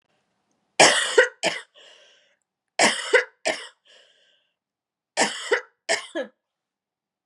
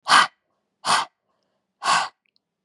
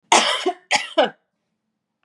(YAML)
three_cough_length: 7.3 s
three_cough_amplitude: 31511
three_cough_signal_mean_std_ratio: 0.33
exhalation_length: 2.6 s
exhalation_amplitude: 27681
exhalation_signal_mean_std_ratio: 0.36
cough_length: 2.0 s
cough_amplitude: 31421
cough_signal_mean_std_ratio: 0.42
survey_phase: beta (2021-08-13 to 2022-03-07)
age: 18-44
gender: Female
wearing_mask: 'No'
symptom_none: true
smoker_status: Never smoked
respiratory_condition_asthma: false
respiratory_condition_other: false
recruitment_source: REACT
submission_delay: 2 days
covid_test_result: Negative
covid_test_method: RT-qPCR
influenza_a_test_result: Negative
influenza_b_test_result: Negative